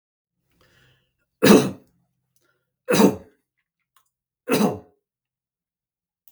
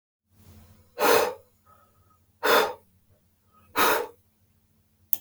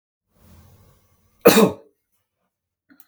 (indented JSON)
{
  "three_cough_length": "6.3 s",
  "three_cough_amplitude": 32766,
  "three_cough_signal_mean_std_ratio": 0.26,
  "exhalation_length": "5.2 s",
  "exhalation_amplitude": 27113,
  "exhalation_signal_mean_std_ratio": 0.35,
  "cough_length": "3.1 s",
  "cough_amplitude": 32768,
  "cough_signal_mean_std_ratio": 0.23,
  "survey_phase": "beta (2021-08-13 to 2022-03-07)",
  "age": "45-64",
  "gender": "Male",
  "wearing_mask": "No",
  "symptom_none": true,
  "smoker_status": "Never smoked",
  "respiratory_condition_asthma": false,
  "respiratory_condition_other": false,
  "recruitment_source": "REACT",
  "submission_delay": "1 day",
  "covid_test_result": "Negative",
  "covid_test_method": "RT-qPCR",
  "influenza_a_test_result": "Negative",
  "influenza_b_test_result": "Negative"
}